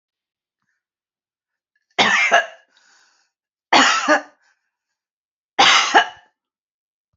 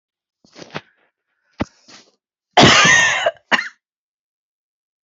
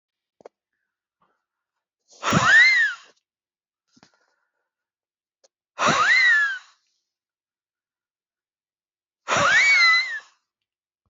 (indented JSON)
{
  "three_cough_length": "7.2 s",
  "three_cough_amplitude": 30349,
  "three_cough_signal_mean_std_ratio": 0.34,
  "cough_length": "5.0 s",
  "cough_amplitude": 31241,
  "cough_signal_mean_std_ratio": 0.34,
  "exhalation_length": "11.1 s",
  "exhalation_amplitude": 17706,
  "exhalation_signal_mean_std_ratio": 0.39,
  "survey_phase": "beta (2021-08-13 to 2022-03-07)",
  "age": "65+",
  "gender": "Female",
  "wearing_mask": "No",
  "symptom_none": true,
  "smoker_status": "Never smoked",
  "respiratory_condition_asthma": false,
  "respiratory_condition_other": false,
  "recruitment_source": "REACT",
  "submission_delay": "1 day",
  "covid_test_result": "Negative",
  "covid_test_method": "RT-qPCR",
  "influenza_a_test_result": "Unknown/Void",
  "influenza_b_test_result": "Unknown/Void"
}